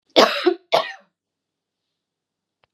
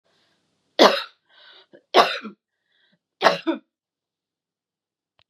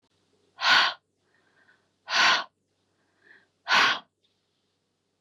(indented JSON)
{
  "cough_length": "2.7 s",
  "cough_amplitude": 32713,
  "cough_signal_mean_std_ratio": 0.29,
  "three_cough_length": "5.3 s",
  "three_cough_amplitude": 32767,
  "three_cough_signal_mean_std_ratio": 0.25,
  "exhalation_length": "5.2 s",
  "exhalation_amplitude": 16012,
  "exhalation_signal_mean_std_ratio": 0.34,
  "survey_phase": "beta (2021-08-13 to 2022-03-07)",
  "age": "18-44",
  "gender": "Female",
  "wearing_mask": "No",
  "symptom_none": true,
  "smoker_status": "Never smoked",
  "respiratory_condition_asthma": false,
  "respiratory_condition_other": false,
  "recruitment_source": "REACT",
  "submission_delay": "3 days",
  "covid_test_result": "Negative",
  "covid_test_method": "RT-qPCR"
}